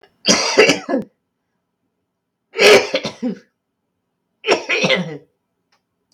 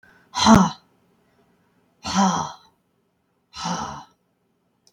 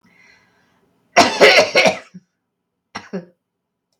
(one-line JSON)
{"three_cough_length": "6.1 s", "three_cough_amplitude": 32768, "three_cough_signal_mean_std_ratio": 0.4, "exhalation_length": "4.9 s", "exhalation_amplitude": 25705, "exhalation_signal_mean_std_ratio": 0.33, "cough_length": "4.0 s", "cough_amplitude": 32768, "cough_signal_mean_std_ratio": 0.34, "survey_phase": "beta (2021-08-13 to 2022-03-07)", "age": "45-64", "gender": "Female", "wearing_mask": "No", "symptom_cough_any": true, "symptom_runny_or_blocked_nose": true, "symptom_sore_throat": true, "symptom_fever_high_temperature": true, "symptom_change_to_sense_of_smell_or_taste": true, "symptom_onset": "5 days", "smoker_status": "Ex-smoker", "respiratory_condition_asthma": false, "respiratory_condition_other": false, "recruitment_source": "Test and Trace", "submission_delay": "2 days", "covid_test_result": "Positive", "covid_test_method": "ePCR"}